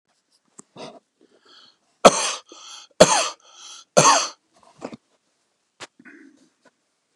{"three_cough_length": "7.2 s", "three_cough_amplitude": 32768, "three_cough_signal_mean_std_ratio": 0.25, "survey_phase": "beta (2021-08-13 to 2022-03-07)", "age": "65+", "gender": "Male", "wearing_mask": "No", "symptom_none": true, "smoker_status": "Ex-smoker", "respiratory_condition_asthma": false, "respiratory_condition_other": false, "recruitment_source": "REACT", "submission_delay": "2 days", "covid_test_result": "Negative", "covid_test_method": "RT-qPCR", "influenza_a_test_result": "Negative", "influenza_b_test_result": "Negative"}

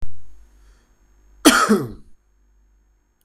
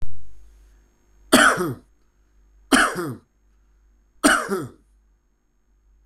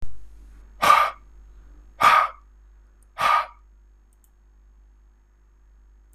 {"cough_length": "3.2 s", "cough_amplitude": 26028, "cough_signal_mean_std_ratio": 0.39, "three_cough_length": "6.1 s", "three_cough_amplitude": 26027, "three_cough_signal_mean_std_ratio": 0.39, "exhalation_length": "6.1 s", "exhalation_amplitude": 25299, "exhalation_signal_mean_std_ratio": 0.36, "survey_phase": "beta (2021-08-13 to 2022-03-07)", "age": "18-44", "gender": "Male", "wearing_mask": "No", "symptom_none": true, "smoker_status": "Current smoker (1 to 10 cigarettes per day)", "respiratory_condition_asthma": false, "respiratory_condition_other": false, "recruitment_source": "REACT", "submission_delay": "5 days", "covid_test_result": "Negative", "covid_test_method": "RT-qPCR"}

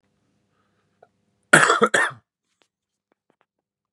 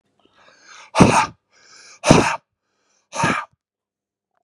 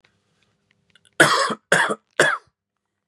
{"cough_length": "3.9 s", "cough_amplitude": 32768, "cough_signal_mean_std_ratio": 0.25, "exhalation_length": "4.4 s", "exhalation_amplitude": 32768, "exhalation_signal_mean_std_ratio": 0.32, "three_cough_length": "3.1 s", "three_cough_amplitude": 31837, "three_cough_signal_mean_std_ratio": 0.37, "survey_phase": "beta (2021-08-13 to 2022-03-07)", "age": "45-64", "gender": "Male", "wearing_mask": "No", "symptom_none": true, "smoker_status": "Current smoker (e-cigarettes or vapes only)", "respiratory_condition_asthma": false, "respiratory_condition_other": false, "recruitment_source": "REACT", "submission_delay": "1 day", "covid_test_result": "Negative", "covid_test_method": "RT-qPCR"}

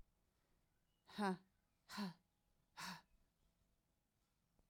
{"exhalation_length": "4.7 s", "exhalation_amplitude": 1140, "exhalation_signal_mean_std_ratio": 0.29, "survey_phase": "alpha (2021-03-01 to 2021-08-12)", "age": "45-64", "gender": "Female", "wearing_mask": "No", "symptom_cough_any": true, "symptom_abdominal_pain": true, "symptom_fatigue": true, "symptom_fever_high_temperature": true, "symptom_headache": true, "symptom_change_to_sense_of_smell_or_taste": true, "smoker_status": "Never smoked", "respiratory_condition_asthma": false, "respiratory_condition_other": false, "recruitment_source": "Test and Trace", "submission_delay": "1 day", "covid_test_result": "Positive", "covid_test_method": "RT-qPCR", "covid_ct_value": 19.1, "covid_ct_gene": "ORF1ab gene", "covid_ct_mean": 19.6, "covid_viral_load": "380000 copies/ml", "covid_viral_load_category": "Low viral load (10K-1M copies/ml)"}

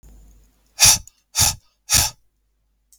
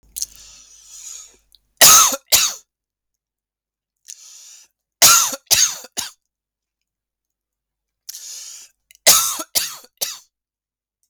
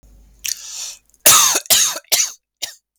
{"exhalation_length": "3.0 s", "exhalation_amplitude": 32768, "exhalation_signal_mean_std_ratio": 0.33, "three_cough_length": "11.1 s", "three_cough_amplitude": 32768, "three_cough_signal_mean_std_ratio": 0.3, "cough_length": "3.0 s", "cough_amplitude": 32768, "cough_signal_mean_std_ratio": 0.46, "survey_phase": "beta (2021-08-13 to 2022-03-07)", "age": "45-64", "gender": "Male", "wearing_mask": "No", "symptom_cough_any": true, "symptom_runny_or_blocked_nose": true, "symptom_sore_throat": true, "smoker_status": "Never smoked", "respiratory_condition_asthma": false, "respiratory_condition_other": false, "recruitment_source": "Test and Trace", "submission_delay": "2 days", "covid_test_result": "Positive", "covid_test_method": "RT-qPCR"}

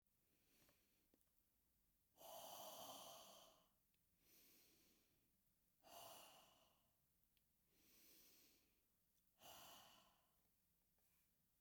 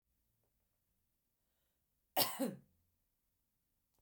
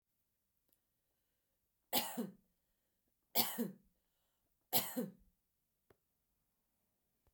{"exhalation_length": "11.6 s", "exhalation_amplitude": 147, "exhalation_signal_mean_std_ratio": 0.53, "cough_length": "4.0 s", "cough_amplitude": 5506, "cough_signal_mean_std_ratio": 0.22, "three_cough_length": "7.3 s", "three_cough_amplitude": 4978, "three_cough_signal_mean_std_ratio": 0.26, "survey_phase": "beta (2021-08-13 to 2022-03-07)", "age": "18-44", "gender": "Female", "wearing_mask": "No", "symptom_none": true, "smoker_status": "Ex-smoker", "respiratory_condition_asthma": false, "respiratory_condition_other": false, "recruitment_source": "REACT", "submission_delay": "14 days", "covid_test_result": "Negative", "covid_test_method": "RT-qPCR"}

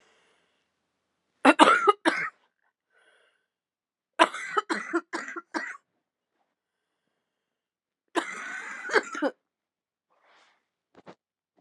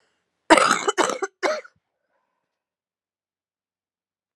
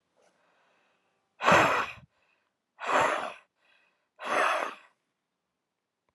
{"three_cough_length": "11.6 s", "three_cough_amplitude": 30580, "three_cough_signal_mean_std_ratio": 0.27, "cough_length": "4.4 s", "cough_amplitude": 32767, "cough_signal_mean_std_ratio": 0.28, "exhalation_length": "6.1 s", "exhalation_amplitude": 15901, "exhalation_signal_mean_std_ratio": 0.36, "survey_phase": "alpha (2021-03-01 to 2021-08-12)", "age": "18-44", "gender": "Female", "wearing_mask": "No", "symptom_cough_any": true, "symptom_new_continuous_cough": true, "symptom_shortness_of_breath": true, "symptom_fatigue": true, "symptom_fever_high_temperature": true, "symptom_headache": true, "symptom_change_to_sense_of_smell_or_taste": true, "symptom_loss_of_taste": true, "symptom_onset": "5 days", "smoker_status": "Never smoked", "respiratory_condition_asthma": true, "respiratory_condition_other": false, "recruitment_source": "Test and Trace", "submission_delay": "1 day", "covid_test_result": "Positive", "covid_test_method": "RT-qPCR"}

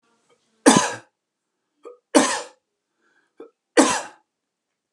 {"three_cough_length": "4.9 s", "three_cough_amplitude": 32332, "three_cough_signal_mean_std_ratio": 0.28, "survey_phase": "beta (2021-08-13 to 2022-03-07)", "age": "65+", "gender": "Male", "wearing_mask": "No", "symptom_none": true, "smoker_status": "Never smoked", "respiratory_condition_asthma": false, "respiratory_condition_other": false, "recruitment_source": "REACT", "submission_delay": "1 day", "covid_test_result": "Negative", "covid_test_method": "RT-qPCR", "influenza_a_test_result": "Negative", "influenza_b_test_result": "Negative"}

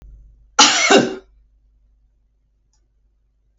{"cough_length": "3.6 s", "cough_amplitude": 32768, "cough_signal_mean_std_ratio": 0.3, "survey_phase": "beta (2021-08-13 to 2022-03-07)", "age": "65+", "gender": "Female", "wearing_mask": "No", "symptom_none": true, "smoker_status": "Ex-smoker", "respiratory_condition_asthma": true, "respiratory_condition_other": false, "recruitment_source": "Test and Trace", "submission_delay": "0 days", "covid_test_result": "Negative", "covid_test_method": "LFT"}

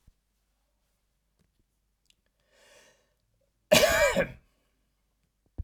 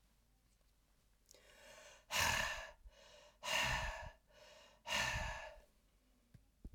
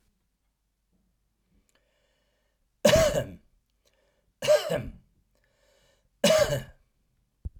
{"cough_length": "5.6 s", "cough_amplitude": 15121, "cough_signal_mean_std_ratio": 0.25, "exhalation_length": "6.7 s", "exhalation_amplitude": 2356, "exhalation_signal_mean_std_ratio": 0.46, "three_cough_length": "7.6 s", "three_cough_amplitude": 16125, "three_cough_signal_mean_std_ratio": 0.31, "survey_phase": "beta (2021-08-13 to 2022-03-07)", "age": "65+", "gender": "Male", "wearing_mask": "No", "symptom_headache": true, "smoker_status": "Ex-smoker", "respiratory_condition_asthma": false, "respiratory_condition_other": false, "recruitment_source": "Test and Trace", "submission_delay": "1 day", "covid_test_result": "Positive", "covid_test_method": "RT-qPCR", "covid_ct_value": 34.9, "covid_ct_gene": "ORF1ab gene", "covid_ct_mean": 35.6, "covid_viral_load": "2.1 copies/ml", "covid_viral_load_category": "Minimal viral load (< 10K copies/ml)"}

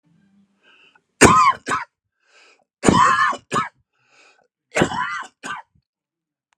{"three_cough_length": "6.6 s", "three_cough_amplitude": 32768, "three_cough_signal_mean_std_ratio": 0.37, "survey_phase": "alpha (2021-03-01 to 2021-08-12)", "age": "45-64", "gender": "Male", "wearing_mask": "No", "symptom_none": true, "smoker_status": "Current smoker (e-cigarettes or vapes only)", "respiratory_condition_asthma": false, "respiratory_condition_other": false, "recruitment_source": "REACT", "submission_delay": "7 days", "covid_test_result": "Negative", "covid_test_method": "RT-qPCR"}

